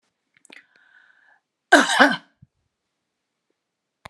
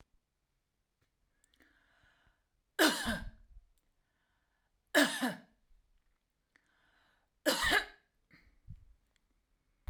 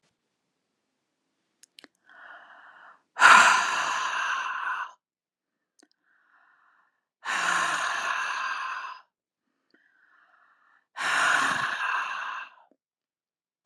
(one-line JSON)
{"cough_length": "4.1 s", "cough_amplitude": 32727, "cough_signal_mean_std_ratio": 0.23, "three_cough_length": "9.9 s", "three_cough_amplitude": 8370, "three_cough_signal_mean_std_ratio": 0.27, "exhalation_length": "13.7 s", "exhalation_amplitude": 26462, "exhalation_signal_mean_std_ratio": 0.4, "survey_phase": "alpha (2021-03-01 to 2021-08-12)", "age": "45-64", "gender": "Female", "wearing_mask": "No", "symptom_none": true, "smoker_status": "Never smoked", "respiratory_condition_asthma": false, "respiratory_condition_other": false, "recruitment_source": "REACT", "submission_delay": "1 day", "covid_test_result": "Negative", "covid_test_method": "RT-qPCR"}